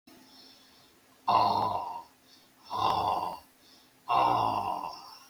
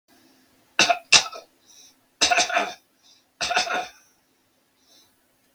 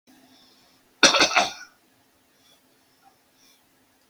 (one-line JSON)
{"exhalation_length": "5.3 s", "exhalation_amplitude": 8362, "exhalation_signal_mean_std_ratio": 0.56, "three_cough_length": "5.5 s", "three_cough_amplitude": 32768, "three_cough_signal_mean_std_ratio": 0.34, "cough_length": "4.1 s", "cough_amplitude": 30162, "cough_signal_mean_std_ratio": 0.25, "survey_phase": "beta (2021-08-13 to 2022-03-07)", "age": "65+", "gender": "Male", "wearing_mask": "No", "symptom_cough_any": true, "symptom_shortness_of_breath": true, "smoker_status": "Ex-smoker", "respiratory_condition_asthma": false, "respiratory_condition_other": true, "recruitment_source": "REACT", "submission_delay": "1 day", "covid_test_result": "Negative", "covid_test_method": "RT-qPCR"}